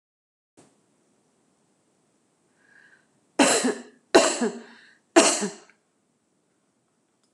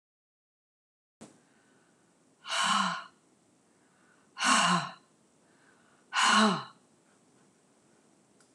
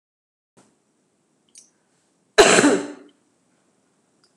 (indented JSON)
{
  "three_cough_length": "7.3 s",
  "three_cough_amplitude": 26027,
  "three_cough_signal_mean_std_ratio": 0.27,
  "exhalation_length": "8.5 s",
  "exhalation_amplitude": 9216,
  "exhalation_signal_mean_std_ratio": 0.34,
  "cough_length": "4.4 s",
  "cough_amplitude": 26028,
  "cough_signal_mean_std_ratio": 0.25,
  "survey_phase": "alpha (2021-03-01 to 2021-08-12)",
  "age": "65+",
  "gender": "Female",
  "wearing_mask": "No",
  "symptom_none": true,
  "smoker_status": "Never smoked",
  "respiratory_condition_asthma": false,
  "respiratory_condition_other": false,
  "recruitment_source": "REACT",
  "submission_delay": "2 days",
  "covid_test_result": "Negative",
  "covid_test_method": "RT-qPCR"
}